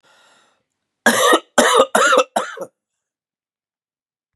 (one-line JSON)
{"three_cough_length": "4.4 s", "three_cough_amplitude": 32768, "three_cough_signal_mean_std_ratio": 0.4, "survey_phase": "beta (2021-08-13 to 2022-03-07)", "age": "45-64", "gender": "Male", "wearing_mask": "No", "symptom_cough_any": true, "symptom_new_continuous_cough": true, "symptom_runny_or_blocked_nose": true, "symptom_sore_throat": true, "symptom_fatigue": true, "symptom_fever_high_temperature": true, "symptom_headache": true, "symptom_onset": "5 days", "smoker_status": "Never smoked", "respiratory_condition_asthma": false, "respiratory_condition_other": false, "recruitment_source": "Test and Trace", "submission_delay": "2 days", "covid_test_result": "Positive", "covid_test_method": "RT-qPCR", "covid_ct_value": 22.1, "covid_ct_gene": "ORF1ab gene", "covid_ct_mean": 22.6, "covid_viral_load": "38000 copies/ml", "covid_viral_load_category": "Low viral load (10K-1M copies/ml)"}